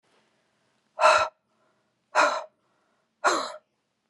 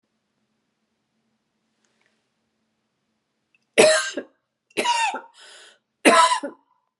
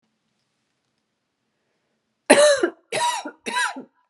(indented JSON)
{
  "exhalation_length": "4.1 s",
  "exhalation_amplitude": 18308,
  "exhalation_signal_mean_std_ratio": 0.33,
  "three_cough_length": "7.0 s",
  "three_cough_amplitude": 31540,
  "three_cough_signal_mean_std_ratio": 0.3,
  "cough_length": "4.1 s",
  "cough_amplitude": 32704,
  "cough_signal_mean_std_ratio": 0.35,
  "survey_phase": "beta (2021-08-13 to 2022-03-07)",
  "age": "45-64",
  "gender": "Female",
  "wearing_mask": "No",
  "symptom_sore_throat": true,
  "symptom_headache": true,
  "smoker_status": "Never smoked",
  "respiratory_condition_asthma": false,
  "respiratory_condition_other": false,
  "recruitment_source": "Test and Trace",
  "submission_delay": "0 days",
  "covid_test_result": "Negative",
  "covid_test_method": "LFT"
}